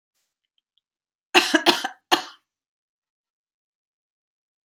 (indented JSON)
{
  "cough_length": "4.6 s",
  "cough_amplitude": 30002,
  "cough_signal_mean_std_ratio": 0.23,
  "survey_phase": "beta (2021-08-13 to 2022-03-07)",
  "age": "65+",
  "gender": "Female",
  "wearing_mask": "No",
  "symptom_runny_or_blocked_nose": true,
  "symptom_onset": "12 days",
  "smoker_status": "Never smoked",
  "respiratory_condition_asthma": false,
  "respiratory_condition_other": false,
  "recruitment_source": "REACT",
  "submission_delay": "1 day",
  "covid_test_result": "Negative",
  "covid_test_method": "RT-qPCR",
  "influenza_a_test_result": "Negative",
  "influenza_b_test_result": "Negative"
}